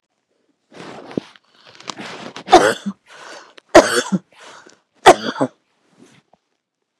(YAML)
three_cough_length: 7.0 s
three_cough_amplitude: 32768
three_cough_signal_mean_std_ratio: 0.26
survey_phase: beta (2021-08-13 to 2022-03-07)
age: 65+
gender: Female
wearing_mask: 'No'
symptom_none: true
smoker_status: Ex-smoker
respiratory_condition_asthma: false
respiratory_condition_other: false
recruitment_source: REACT
submission_delay: 2 days
covid_test_result: Negative
covid_test_method: RT-qPCR
influenza_a_test_result: Negative
influenza_b_test_result: Negative